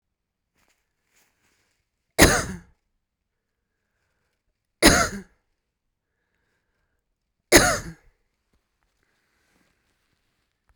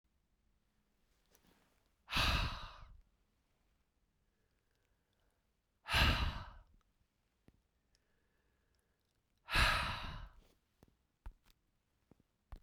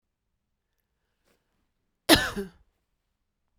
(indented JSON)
{
  "three_cough_length": "10.8 s",
  "three_cough_amplitude": 32768,
  "three_cough_signal_mean_std_ratio": 0.2,
  "exhalation_length": "12.6 s",
  "exhalation_amplitude": 4057,
  "exhalation_signal_mean_std_ratio": 0.3,
  "cough_length": "3.6 s",
  "cough_amplitude": 26319,
  "cough_signal_mean_std_ratio": 0.18,
  "survey_phase": "beta (2021-08-13 to 2022-03-07)",
  "age": "45-64",
  "gender": "Female",
  "wearing_mask": "No",
  "symptom_cough_any": true,
  "symptom_runny_or_blocked_nose": true,
  "symptom_sore_throat": true,
  "smoker_status": "Current smoker (1 to 10 cigarettes per day)",
  "respiratory_condition_asthma": false,
  "respiratory_condition_other": false,
  "recruitment_source": "Test and Trace",
  "submission_delay": "1 day",
  "covid_test_result": "Positive",
  "covid_test_method": "RT-qPCR",
  "covid_ct_value": 18.4,
  "covid_ct_gene": "ORF1ab gene",
  "covid_ct_mean": 19.0,
  "covid_viral_load": "590000 copies/ml",
  "covid_viral_load_category": "Low viral load (10K-1M copies/ml)"
}